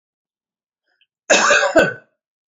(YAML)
cough_length: 2.5 s
cough_amplitude: 30766
cough_signal_mean_std_ratio: 0.4
survey_phase: beta (2021-08-13 to 2022-03-07)
age: 45-64
gender: Male
wearing_mask: 'No'
symptom_none: true
smoker_status: Never smoked
respiratory_condition_asthma: false
respiratory_condition_other: false
recruitment_source: REACT
submission_delay: 3 days
covid_test_result: Negative
covid_test_method: RT-qPCR
influenza_a_test_result: Unknown/Void
influenza_b_test_result: Unknown/Void